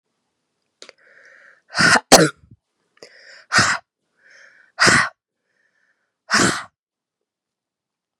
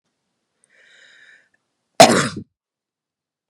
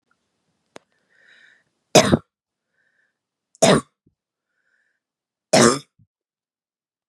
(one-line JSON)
{"exhalation_length": "8.2 s", "exhalation_amplitude": 32768, "exhalation_signal_mean_std_ratio": 0.3, "cough_length": "3.5 s", "cough_amplitude": 32768, "cough_signal_mean_std_ratio": 0.2, "three_cough_length": "7.1 s", "three_cough_amplitude": 32768, "three_cough_signal_mean_std_ratio": 0.22, "survey_phase": "beta (2021-08-13 to 2022-03-07)", "age": "18-44", "gender": "Female", "wearing_mask": "No", "symptom_fatigue": true, "symptom_headache": true, "smoker_status": "Never smoked", "respiratory_condition_asthma": true, "respiratory_condition_other": false, "recruitment_source": "Test and Trace", "submission_delay": "4 days", "covid_test_result": "Negative", "covid_test_method": "ePCR"}